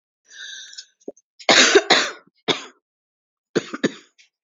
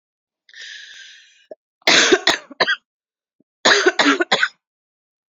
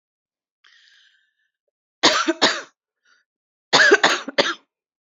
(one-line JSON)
{"three_cough_length": "4.4 s", "three_cough_amplitude": 32331, "three_cough_signal_mean_std_ratio": 0.33, "cough_length": "5.3 s", "cough_amplitude": 30399, "cough_signal_mean_std_ratio": 0.39, "exhalation_length": "5.0 s", "exhalation_amplitude": 32768, "exhalation_signal_mean_std_ratio": 0.34, "survey_phase": "beta (2021-08-13 to 2022-03-07)", "age": "45-64", "gender": "Female", "wearing_mask": "No", "symptom_cough_any": true, "symptom_runny_or_blocked_nose": true, "symptom_shortness_of_breath": true, "symptom_sore_throat": true, "symptom_abdominal_pain": true, "symptom_fatigue": true, "symptom_fever_high_temperature": true, "symptom_change_to_sense_of_smell_or_taste": true, "symptom_loss_of_taste": true, "symptom_onset": "4 days", "smoker_status": "Never smoked", "respiratory_condition_asthma": false, "respiratory_condition_other": false, "recruitment_source": "Test and Trace", "submission_delay": "1 day", "covid_test_result": "Positive", "covid_test_method": "RT-qPCR", "covid_ct_value": 23.0, "covid_ct_gene": "ORF1ab gene"}